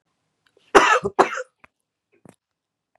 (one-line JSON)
{"cough_length": "3.0 s", "cough_amplitude": 32768, "cough_signal_mean_std_ratio": 0.27, "survey_phase": "beta (2021-08-13 to 2022-03-07)", "age": "45-64", "gender": "Female", "wearing_mask": "No", "symptom_none": true, "smoker_status": "Current smoker (1 to 10 cigarettes per day)", "respiratory_condition_asthma": false, "respiratory_condition_other": false, "recruitment_source": "REACT", "submission_delay": "3 days", "covid_test_result": "Negative", "covid_test_method": "RT-qPCR"}